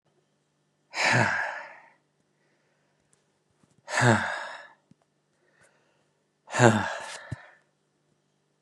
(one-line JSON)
{"exhalation_length": "8.6 s", "exhalation_amplitude": 28834, "exhalation_signal_mean_std_ratio": 0.32, "survey_phase": "beta (2021-08-13 to 2022-03-07)", "age": "18-44", "gender": "Male", "wearing_mask": "No", "symptom_runny_or_blocked_nose": true, "symptom_headache": true, "symptom_onset": "3 days", "smoker_status": "Never smoked", "respiratory_condition_asthma": true, "respiratory_condition_other": false, "recruitment_source": "Test and Trace", "submission_delay": "2 days", "covid_test_result": "Positive", "covid_test_method": "RT-qPCR", "covid_ct_value": 27.5, "covid_ct_gene": "ORF1ab gene"}